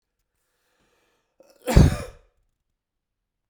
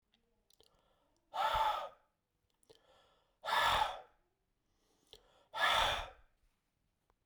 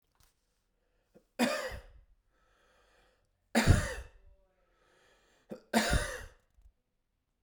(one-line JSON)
{"cough_length": "3.5 s", "cough_amplitude": 32767, "cough_signal_mean_std_ratio": 0.21, "exhalation_length": "7.3 s", "exhalation_amplitude": 4230, "exhalation_signal_mean_std_ratio": 0.38, "three_cough_length": "7.4 s", "three_cough_amplitude": 9839, "three_cough_signal_mean_std_ratio": 0.3, "survey_phase": "beta (2021-08-13 to 2022-03-07)", "age": "45-64", "gender": "Male", "wearing_mask": "No", "symptom_cough_any": true, "symptom_runny_or_blocked_nose": true, "symptom_sore_throat": true, "symptom_fatigue": true, "symptom_headache": true, "symptom_change_to_sense_of_smell_or_taste": true, "smoker_status": "Ex-smoker", "respiratory_condition_asthma": false, "respiratory_condition_other": false, "recruitment_source": "Test and Trace", "submission_delay": "1 day", "covid_test_result": "Positive", "covid_test_method": "RT-qPCR", "covid_ct_value": 27.2, "covid_ct_gene": "ORF1ab gene", "covid_ct_mean": 27.6, "covid_viral_load": "870 copies/ml", "covid_viral_load_category": "Minimal viral load (< 10K copies/ml)"}